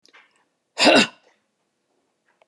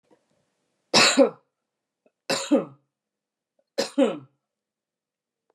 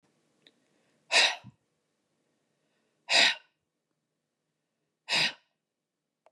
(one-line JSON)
{"cough_length": "2.5 s", "cough_amplitude": 25503, "cough_signal_mean_std_ratio": 0.27, "three_cough_length": "5.5 s", "three_cough_amplitude": 21889, "three_cough_signal_mean_std_ratio": 0.3, "exhalation_length": "6.3 s", "exhalation_amplitude": 12584, "exhalation_signal_mean_std_ratio": 0.26, "survey_phase": "beta (2021-08-13 to 2022-03-07)", "age": "45-64", "gender": "Female", "wearing_mask": "No", "symptom_none": true, "smoker_status": "Never smoked", "respiratory_condition_asthma": false, "respiratory_condition_other": false, "recruitment_source": "REACT", "submission_delay": "1 day", "covid_test_result": "Negative", "covid_test_method": "RT-qPCR"}